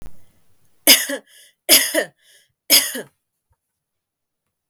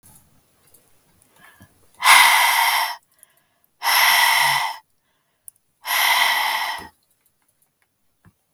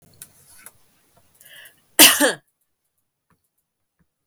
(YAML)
three_cough_length: 4.7 s
three_cough_amplitude: 32768
three_cough_signal_mean_std_ratio: 0.31
exhalation_length: 8.5 s
exhalation_amplitude: 32768
exhalation_signal_mean_std_ratio: 0.46
cough_length: 4.3 s
cough_amplitude: 32768
cough_signal_mean_std_ratio: 0.21
survey_phase: beta (2021-08-13 to 2022-03-07)
age: 18-44
gender: Female
wearing_mask: 'No'
symptom_runny_or_blocked_nose: true
symptom_onset: 6 days
smoker_status: Never smoked
respiratory_condition_asthma: false
respiratory_condition_other: false
recruitment_source: REACT
submission_delay: 1 day
covid_test_result: Negative
covid_test_method: RT-qPCR
influenza_a_test_result: Negative
influenza_b_test_result: Negative